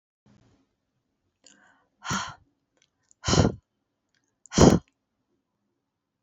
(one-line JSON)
{"exhalation_length": "6.2 s", "exhalation_amplitude": 27083, "exhalation_signal_mean_std_ratio": 0.23, "survey_phase": "beta (2021-08-13 to 2022-03-07)", "age": "45-64", "gender": "Female", "wearing_mask": "No", "symptom_none": true, "smoker_status": "Never smoked", "respiratory_condition_asthma": false, "respiratory_condition_other": false, "recruitment_source": "Test and Trace", "submission_delay": "0 days", "covid_test_result": "Negative", "covid_test_method": "LFT"}